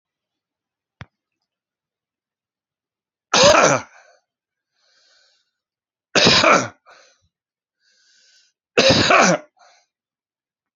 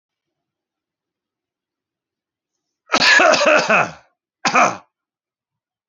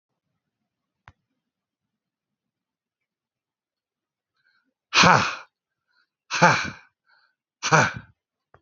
{"three_cough_length": "10.8 s", "three_cough_amplitude": 32367, "three_cough_signal_mean_std_ratio": 0.31, "cough_length": "5.9 s", "cough_amplitude": 31763, "cough_signal_mean_std_ratio": 0.35, "exhalation_length": "8.6 s", "exhalation_amplitude": 32696, "exhalation_signal_mean_std_ratio": 0.24, "survey_phase": "alpha (2021-03-01 to 2021-08-12)", "age": "45-64", "gender": "Male", "wearing_mask": "No", "symptom_none": true, "smoker_status": "Ex-smoker", "respiratory_condition_asthma": false, "respiratory_condition_other": false, "recruitment_source": "Test and Trace", "submission_delay": "2 days", "covid_test_result": "Positive", "covid_test_method": "RT-qPCR", "covid_ct_value": 26.4, "covid_ct_gene": "N gene"}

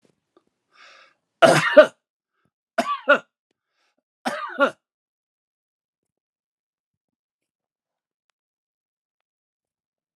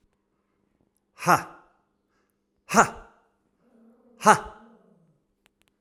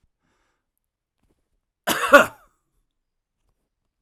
{"three_cough_length": "10.2 s", "three_cough_amplitude": 32767, "three_cough_signal_mean_std_ratio": 0.2, "exhalation_length": "5.8 s", "exhalation_amplitude": 30650, "exhalation_signal_mean_std_ratio": 0.21, "cough_length": "4.0 s", "cough_amplitude": 32768, "cough_signal_mean_std_ratio": 0.19, "survey_phase": "alpha (2021-03-01 to 2021-08-12)", "age": "45-64", "gender": "Male", "wearing_mask": "No", "symptom_none": true, "smoker_status": "Never smoked", "respiratory_condition_asthma": false, "respiratory_condition_other": false, "recruitment_source": "REACT", "submission_delay": "1 day", "covid_test_result": "Negative", "covid_test_method": "RT-qPCR"}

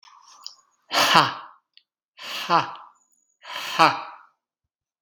{"exhalation_length": "5.0 s", "exhalation_amplitude": 32768, "exhalation_signal_mean_std_ratio": 0.33, "survey_phase": "beta (2021-08-13 to 2022-03-07)", "age": "18-44", "gender": "Male", "wearing_mask": "No", "symptom_none": true, "smoker_status": "Never smoked", "respiratory_condition_asthma": false, "respiratory_condition_other": false, "recruitment_source": "Test and Trace", "submission_delay": "-1 day", "covid_test_result": "Negative", "covid_test_method": "LFT"}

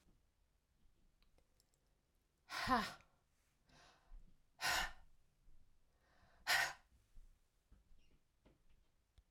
{"exhalation_length": "9.3 s", "exhalation_amplitude": 2300, "exhalation_signal_mean_std_ratio": 0.29, "survey_phase": "alpha (2021-03-01 to 2021-08-12)", "age": "45-64", "gender": "Female", "wearing_mask": "No", "symptom_none": true, "smoker_status": "Never smoked", "respiratory_condition_asthma": false, "respiratory_condition_other": false, "recruitment_source": "REACT", "submission_delay": "2 days", "covid_test_result": "Negative", "covid_test_method": "RT-qPCR"}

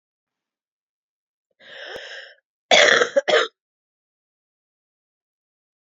{"cough_length": "5.8 s", "cough_amplitude": 29292, "cough_signal_mean_std_ratio": 0.26, "survey_phase": "beta (2021-08-13 to 2022-03-07)", "age": "45-64", "gender": "Female", "wearing_mask": "No", "symptom_cough_any": true, "symptom_new_continuous_cough": true, "symptom_runny_or_blocked_nose": true, "symptom_sore_throat": true, "symptom_abdominal_pain": true, "symptom_fatigue": true, "symptom_fever_high_temperature": true, "symptom_headache": true, "symptom_other": true, "symptom_onset": "3 days", "smoker_status": "Ex-smoker", "respiratory_condition_asthma": true, "respiratory_condition_other": false, "recruitment_source": "Test and Trace", "submission_delay": "2 days", "covid_test_result": "Positive", "covid_test_method": "RT-qPCR", "covid_ct_value": 15.3, "covid_ct_gene": "ORF1ab gene", "covid_ct_mean": 16.8, "covid_viral_load": "3100000 copies/ml", "covid_viral_load_category": "High viral load (>1M copies/ml)"}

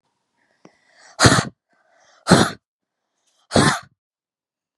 {"exhalation_length": "4.8 s", "exhalation_amplitude": 32768, "exhalation_signal_mean_std_ratio": 0.29, "survey_phase": "beta (2021-08-13 to 2022-03-07)", "age": "18-44", "gender": "Female", "wearing_mask": "No", "symptom_none": true, "smoker_status": "Never smoked", "respiratory_condition_asthma": false, "respiratory_condition_other": false, "recruitment_source": "REACT", "submission_delay": "1 day", "covid_test_result": "Negative", "covid_test_method": "RT-qPCR", "covid_ct_value": 38.1, "covid_ct_gene": "N gene", "influenza_a_test_result": "Negative", "influenza_b_test_result": "Negative"}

